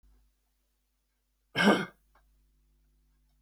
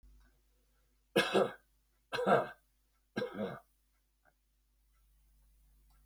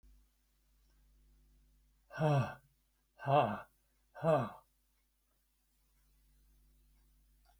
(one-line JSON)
{"cough_length": "3.4 s", "cough_amplitude": 10831, "cough_signal_mean_std_ratio": 0.23, "three_cough_length": "6.1 s", "three_cough_amplitude": 5758, "three_cough_signal_mean_std_ratio": 0.3, "exhalation_length": "7.6 s", "exhalation_amplitude": 4794, "exhalation_signal_mean_std_ratio": 0.29, "survey_phase": "beta (2021-08-13 to 2022-03-07)", "age": "65+", "gender": "Male", "wearing_mask": "No", "symptom_none": true, "smoker_status": "Ex-smoker", "respiratory_condition_asthma": false, "respiratory_condition_other": false, "recruitment_source": "REACT", "submission_delay": "2 days", "covid_test_result": "Negative", "covid_test_method": "RT-qPCR"}